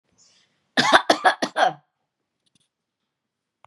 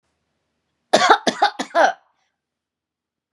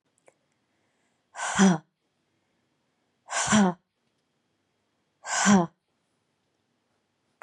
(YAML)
cough_length: 3.7 s
cough_amplitude: 32767
cough_signal_mean_std_ratio: 0.3
three_cough_length: 3.3 s
three_cough_amplitude: 32229
three_cough_signal_mean_std_ratio: 0.33
exhalation_length: 7.4 s
exhalation_amplitude: 16595
exhalation_signal_mean_std_ratio: 0.29
survey_phase: beta (2021-08-13 to 2022-03-07)
age: 45-64
gender: Female
wearing_mask: 'No'
symptom_none: true
smoker_status: Never smoked
respiratory_condition_asthma: false
respiratory_condition_other: false
recruitment_source: REACT
submission_delay: 2 days
covid_test_result: Negative
covid_test_method: RT-qPCR
influenza_a_test_result: Negative
influenza_b_test_result: Negative